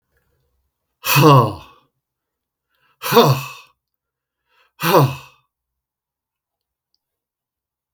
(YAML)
exhalation_length: 7.9 s
exhalation_amplitude: 32768
exhalation_signal_mean_std_ratio: 0.29
survey_phase: beta (2021-08-13 to 2022-03-07)
age: 65+
gender: Male
wearing_mask: 'No'
symptom_none: true
smoker_status: Never smoked
respiratory_condition_asthma: false
respiratory_condition_other: false
recruitment_source: REACT
submission_delay: 2 days
covid_test_result: Negative
covid_test_method: RT-qPCR
influenza_a_test_result: Negative
influenza_b_test_result: Negative